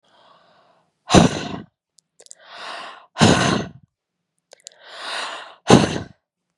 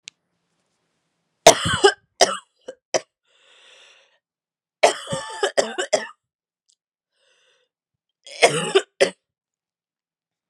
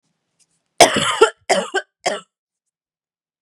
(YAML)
exhalation_length: 6.6 s
exhalation_amplitude: 32768
exhalation_signal_mean_std_ratio: 0.33
three_cough_length: 10.5 s
three_cough_amplitude: 32768
three_cough_signal_mean_std_ratio: 0.26
cough_length: 3.4 s
cough_amplitude: 32768
cough_signal_mean_std_ratio: 0.32
survey_phase: beta (2021-08-13 to 2022-03-07)
age: 18-44
gender: Female
wearing_mask: 'No'
symptom_runny_or_blocked_nose: true
symptom_fatigue: true
symptom_fever_high_temperature: true
symptom_headache: true
symptom_onset: 3 days
smoker_status: Ex-smoker
respiratory_condition_asthma: false
respiratory_condition_other: false
recruitment_source: Test and Trace
submission_delay: 2 days
covid_test_result: Positive
covid_test_method: RT-qPCR
covid_ct_value: 18.8
covid_ct_gene: ORF1ab gene